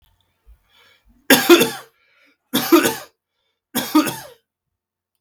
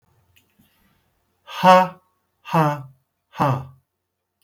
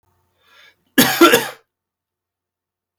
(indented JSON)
{
  "three_cough_length": "5.2 s",
  "three_cough_amplitude": 32768,
  "three_cough_signal_mean_std_ratio": 0.33,
  "exhalation_length": "4.4 s",
  "exhalation_amplitude": 32440,
  "exhalation_signal_mean_std_ratio": 0.32,
  "cough_length": "3.0 s",
  "cough_amplitude": 32768,
  "cough_signal_mean_std_ratio": 0.29,
  "survey_phase": "beta (2021-08-13 to 2022-03-07)",
  "age": "65+",
  "gender": "Male",
  "wearing_mask": "No",
  "symptom_none": true,
  "smoker_status": "Ex-smoker",
  "respiratory_condition_asthma": false,
  "respiratory_condition_other": false,
  "recruitment_source": "REACT",
  "submission_delay": "1 day",
  "covid_test_result": "Negative",
  "covid_test_method": "RT-qPCR",
  "influenza_a_test_result": "Negative",
  "influenza_b_test_result": "Negative"
}